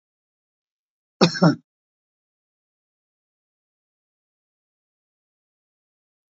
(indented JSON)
{
  "cough_length": "6.3 s",
  "cough_amplitude": 29231,
  "cough_signal_mean_std_ratio": 0.15,
  "survey_phase": "beta (2021-08-13 to 2022-03-07)",
  "age": "65+",
  "gender": "Male",
  "wearing_mask": "No",
  "symptom_fatigue": true,
  "symptom_fever_high_temperature": true,
  "symptom_onset": "3 days",
  "smoker_status": "Never smoked",
  "respiratory_condition_asthma": true,
  "respiratory_condition_other": true,
  "recruitment_source": "Test and Trace",
  "submission_delay": "2 days",
  "covid_test_result": "Positive",
  "covid_test_method": "RT-qPCR",
  "covid_ct_value": 14.7,
  "covid_ct_gene": "ORF1ab gene",
  "covid_ct_mean": 15.3,
  "covid_viral_load": "9900000 copies/ml",
  "covid_viral_load_category": "High viral load (>1M copies/ml)"
}